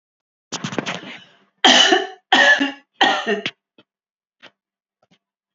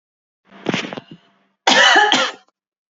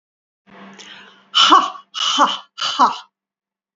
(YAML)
three_cough_length: 5.5 s
three_cough_amplitude: 32768
three_cough_signal_mean_std_ratio: 0.39
cough_length: 2.9 s
cough_amplitude: 32768
cough_signal_mean_std_ratio: 0.43
exhalation_length: 3.8 s
exhalation_amplitude: 32768
exhalation_signal_mean_std_ratio: 0.42
survey_phase: beta (2021-08-13 to 2022-03-07)
age: 45-64
gender: Female
wearing_mask: 'No'
symptom_none: true
smoker_status: Ex-smoker
respiratory_condition_asthma: false
respiratory_condition_other: false
recruitment_source: REACT
submission_delay: 2 days
covid_test_result: Negative
covid_test_method: RT-qPCR